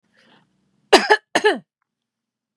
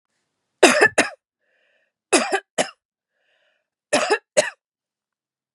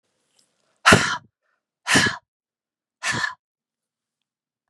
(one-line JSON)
{"cough_length": "2.6 s", "cough_amplitude": 32768, "cough_signal_mean_std_ratio": 0.28, "three_cough_length": "5.5 s", "three_cough_amplitude": 32767, "three_cough_signal_mean_std_ratio": 0.31, "exhalation_length": "4.7 s", "exhalation_amplitude": 32760, "exhalation_signal_mean_std_ratio": 0.29, "survey_phase": "beta (2021-08-13 to 2022-03-07)", "age": "18-44", "gender": "Female", "wearing_mask": "No", "symptom_none": true, "smoker_status": "Never smoked", "respiratory_condition_asthma": true, "respiratory_condition_other": false, "recruitment_source": "REACT", "submission_delay": "1 day", "covid_test_result": "Negative", "covid_test_method": "RT-qPCR", "influenza_a_test_result": "Negative", "influenza_b_test_result": "Negative"}